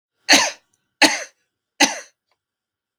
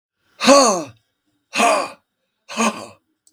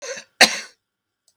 three_cough_length: 3.0 s
three_cough_amplitude: 32768
three_cough_signal_mean_std_ratio: 0.3
exhalation_length: 3.3 s
exhalation_amplitude: 32768
exhalation_signal_mean_std_ratio: 0.41
cough_length: 1.4 s
cough_amplitude: 32768
cough_signal_mean_std_ratio: 0.25
survey_phase: beta (2021-08-13 to 2022-03-07)
age: 65+
gender: Male
wearing_mask: 'No'
symptom_cough_any: true
symptom_shortness_of_breath: true
symptom_sore_throat: true
symptom_diarrhoea: true
symptom_fatigue: true
symptom_change_to_sense_of_smell_or_taste: true
symptom_onset: 3 days
smoker_status: Never smoked
respiratory_condition_asthma: false
respiratory_condition_other: false
recruitment_source: Test and Trace
submission_delay: 1 day
covid_test_result: Positive
covid_test_method: RT-qPCR
covid_ct_value: 16.7
covid_ct_gene: ORF1ab gene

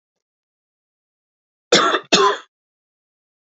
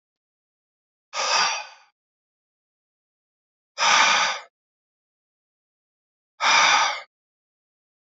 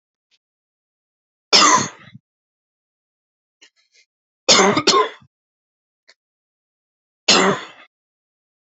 cough_length: 3.6 s
cough_amplitude: 32767
cough_signal_mean_std_ratio: 0.3
exhalation_length: 8.1 s
exhalation_amplitude: 19087
exhalation_signal_mean_std_ratio: 0.36
three_cough_length: 8.8 s
three_cough_amplitude: 32767
three_cough_signal_mean_std_ratio: 0.29
survey_phase: beta (2021-08-13 to 2022-03-07)
age: 18-44
gender: Male
wearing_mask: 'No'
symptom_abdominal_pain: true
symptom_fever_high_temperature: true
symptom_other: true
smoker_status: Never smoked
respiratory_condition_asthma: false
respiratory_condition_other: false
recruitment_source: REACT
submission_delay: 1 day
covid_test_result: Negative
covid_test_method: RT-qPCR
influenza_a_test_result: Negative
influenza_b_test_result: Negative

